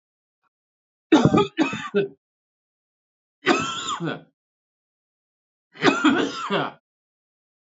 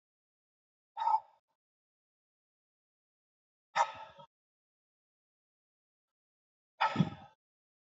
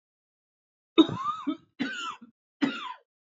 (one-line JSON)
{"three_cough_length": "7.7 s", "three_cough_amplitude": 26323, "three_cough_signal_mean_std_ratio": 0.38, "exhalation_length": "7.9 s", "exhalation_amplitude": 5482, "exhalation_signal_mean_std_ratio": 0.22, "cough_length": "3.2 s", "cough_amplitude": 14063, "cough_signal_mean_std_ratio": 0.35, "survey_phase": "alpha (2021-03-01 to 2021-08-12)", "age": "18-44", "gender": "Male", "wearing_mask": "No", "symptom_cough_any": true, "symptom_headache": true, "symptom_onset": "4 days", "smoker_status": "Current smoker (1 to 10 cigarettes per day)", "respiratory_condition_asthma": false, "respiratory_condition_other": false, "recruitment_source": "Test and Trace", "submission_delay": "2 days", "covid_test_result": "Positive", "covid_test_method": "RT-qPCR", "covid_ct_value": 13.3, "covid_ct_gene": "N gene", "covid_ct_mean": 14.1, "covid_viral_load": "24000000 copies/ml", "covid_viral_load_category": "High viral load (>1M copies/ml)"}